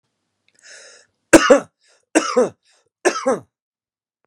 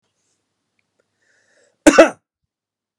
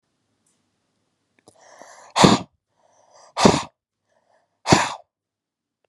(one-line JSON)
{"three_cough_length": "4.3 s", "three_cough_amplitude": 32768, "three_cough_signal_mean_std_ratio": 0.3, "cough_length": "3.0 s", "cough_amplitude": 32768, "cough_signal_mean_std_ratio": 0.19, "exhalation_length": "5.9 s", "exhalation_amplitude": 32768, "exhalation_signal_mean_std_ratio": 0.25, "survey_phase": "beta (2021-08-13 to 2022-03-07)", "age": "18-44", "gender": "Male", "wearing_mask": "No", "symptom_none": true, "smoker_status": "Current smoker (e-cigarettes or vapes only)", "respiratory_condition_asthma": false, "respiratory_condition_other": false, "recruitment_source": "REACT", "submission_delay": "1 day", "covid_test_result": "Negative", "covid_test_method": "RT-qPCR"}